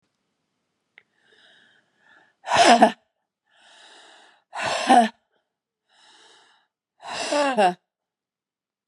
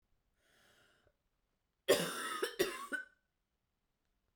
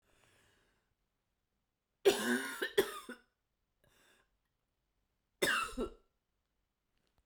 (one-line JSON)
{"exhalation_length": "8.9 s", "exhalation_amplitude": 32427, "exhalation_signal_mean_std_ratio": 0.3, "cough_length": "4.4 s", "cough_amplitude": 5416, "cough_signal_mean_std_ratio": 0.32, "three_cough_length": "7.3 s", "three_cough_amplitude": 5433, "three_cough_signal_mean_std_ratio": 0.29, "survey_phase": "beta (2021-08-13 to 2022-03-07)", "age": "45-64", "gender": "Female", "wearing_mask": "No", "symptom_cough_any": true, "symptom_runny_or_blocked_nose": true, "symptom_shortness_of_breath": true, "symptom_fatigue": true, "symptom_headache": true, "symptom_change_to_sense_of_smell_or_taste": true, "symptom_loss_of_taste": true, "symptom_onset": "5 days", "smoker_status": "Ex-smoker", "respiratory_condition_asthma": false, "respiratory_condition_other": false, "recruitment_source": "Test and Trace", "submission_delay": "1 day", "covid_test_result": "Positive", "covid_test_method": "RT-qPCR", "covid_ct_value": 16.5, "covid_ct_gene": "ORF1ab gene", "covid_ct_mean": 17.0, "covid_viral_load": "2600000 copies/ml", "covid_viral_load_category": "High viral load (>1M copies/ml)"}